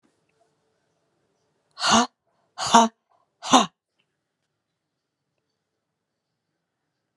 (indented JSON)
{
  "exhalation_length": "7.2 s",
  "exhalation_amplitude": 32070,
  "exhalation_signal_mean_std_ratio": 0.22,
  "survey_phase": "alpha (2021-03-01 to 2021-08-12)",
  "age": "45-64",
  "gender": "Female",
  "wearing_mask": "No",
  "symptom_change_to_sense_of_smell_or_taste": true,
  "symptom_onset": "4 days",
  "smoker_status": "Never smoked",
  "respiratory_condition_asthma": false,
  "respiratory_condition_other": false,
  "recruitment_source": "Test and Trace",
  "submission_delay": "1 day",
  "covid_test_result": "Positive",
  "covid_test_method": "RT-qPCR",
  "covid_ct_value": 20.5,
  "covid_ct_gene": "ORF1ab gene",
  "covid_ct_mean": 22.1,
  "covid_viral_load": "55000 copies/ml",
  "covid_viral_load_category": "Low viral load (10K-1M copies/ml)"
}